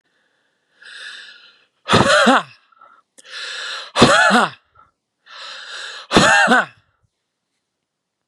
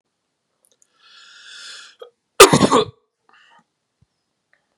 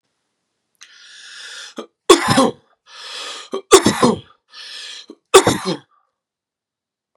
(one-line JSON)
{"exhalation_length": "8.3 s", "exhalation_amplitude": 32768, "exhalation_signal_mean_std_ratio": 0.4, "cough_length": "4.8 s", "cough_amplitude": 32768, "cough_signal_mean_std_ratio": 0.22, "three_cough_length": "7.2 s", "three_cough_amplitude": 32768, "three_cough_signal_mean_std_ratio": 0.32, "survey_phase": "beta (2021-08-13 to 2022-03-07)", "age": "18-44", "gender": "Male", "wearing_mask": "No", "symptom_none": true, "smoker_status": "Never smoked", "respiratory_condition_asthma": false, "respiratory_condition_other": false, "recruitment_source": "REACT", "submission_delay": "6 days", "covid_test_result": "Negative", "covid_test_method": "RT-qPCR"}